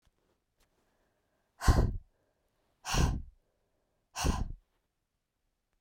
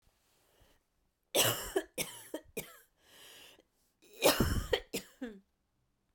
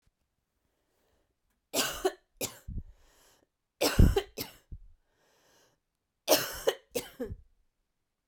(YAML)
exhalation_length: 5.8 s
exhalation_amplitude: 7534
exhalation_signal_mean_std_ratio: 0.31
cough_length: 6.1 s
cough_amplitude: 8902
cough_signal_mean_std_ratio: 0.35
three_cough_length: 8.3 s
three_cough_amplitude: 13234
three_cough_signal_mean_std_ratio: 0.28
survey_phase: beta (2021-08-13 to 2022-03-07)
age: 45-64
gender: Female
wearing_mask: 'No'
symptom_cough_any: true
symptom_runny_or_blocked_nose: true
symptom_shortness_of_breath: true
symptom_sore_throat: true
symptom_abdominal_pain: true
symptom_fatigue: true
symptom_fever_high_temperature: true
symptom_headache: true
symptom_change_to_sense_of_smell_or_taste: true
symptom_onset: 3 days
smoker_status: Ex-smoker
respiratory_condition_asthma: false
respiratory_condition_other: false
recruitment_source: Test and Trace
submission_delay: 2 days
covid_test_result: Positive
covid_test_method: RT-qPCR
covid_ct_value: 18.1
covid_ct_gene: ORF1ab gene